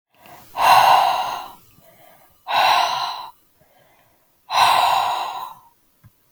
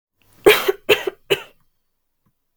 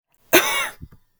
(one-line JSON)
{"exhalation_length": "6.3 s", "exhalation_amplitude": 30010, "exhalation_signal_mean_std_ratio": 0.51, "three_cough_length": "2.6 s", "three_cough_amplitude": 32768, "three_cough_signal_mean_std_ratio": 0.3, "cough_length": "1.2 s", "cough_amplitude": 32768, "cough_signal_mean_std_ratio": 0.4, "survey_phase": "beta (2021-08-13 to 2022-03-07)", "age": "18-44", "gender": "Female", "wearing_mask": "No", "symptom_runny_or_blocked_nose": true, "symptom_headache": true, "symptom_onset": "8 days", "smoker_status": "Never smoked", "respiratory_condition_asthma": false, "respiratory_condition_other": false, "recruitment_source": "REACT", "submission_delay": "0 days", "covid_test_result": "Negative", "covid_test_method": "RT-qPCR", "influenza_a_test_result": "Negative", "influenza_b_test_result": "Negative"}